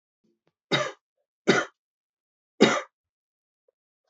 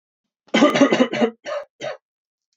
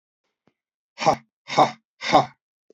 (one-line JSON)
{"three_cough_length": "4.1 s", "three_cough_amplitude": 24106, "three_cough_signal_mean_std_ratio": 0.26, "cough_length": "2.6 s", "cough_amplitude": 26402, "cough_signal_mean_std_ratio": 0.45, "exhalation_length": "2.7 s", "exhalation_amplitude": 26009, "exhalation_signal_mean_std_ratio": 0.31, "survey_phase": "beta (2021-08-13 to 2022-03-07)", "age": "45-64", "gender": "Male", "wearing_mask": "No", "symptom_none": true, "smoker_status": "Never smoked", "respiratory_condition_asthma": true, "respiratory_condition_other": false, "recruitment_source": "Test and Trace", "submission_delay": "1 day", "covid_test_result": "Positive", "covid_test_method": "RT-qPCR", "covid_ct_value": 22.3, "covid_ct_gene": "ORF1ab gene", "covid_ct_mean": 22.7, "covid_viral_load": "37000 copies/ml", "covid_viral_load_category": "Low viral load (10K-1M copies/ml)"}